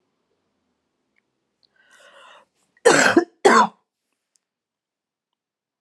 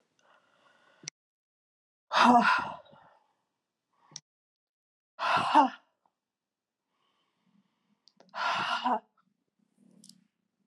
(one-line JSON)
{"cough_length": "5.8 s", "cough_amplitude": 31473, "cough_signal_mean_std_ratio": 0.25, "exhalation_length": "10.7 s", "exhalation_amplitude": 12009, "exhalation_signal_mean_std_ratio": 0.29, "survey_phase": "alpha (2021-03-01 to 2021-08-12)", "age": "45-64", "gender": "Female", "wearing_mask": "No", "symptom_cough_any": true, "symptom_diarrhoea": true, "symptom_fatigue": true, "symptom_fever_high_temperature": true, "symptom_change_to_sense_of_smell_or_taste": true, "symptom_loss_of_taste": true, "symptom_onset": "6 days", "smoker_status": "Never smoked", "respiratory_condition_asthma": false, "respiratory_condition_other": false, "recruitment_source": "Test and Trace", "submission_delay": "2 days", "covid_test_result": "Positive", "covid_test_method": "RT-qPCR", "covid_ct_value": 22.0, "covid_ct_gene": "ORF1ab gene", "covid_ct_mean": 22.1, "covid_viral_load": "57000 copies/ml", "covid_viral_load_category": "Low viral load (10K-1M copies/ml)"}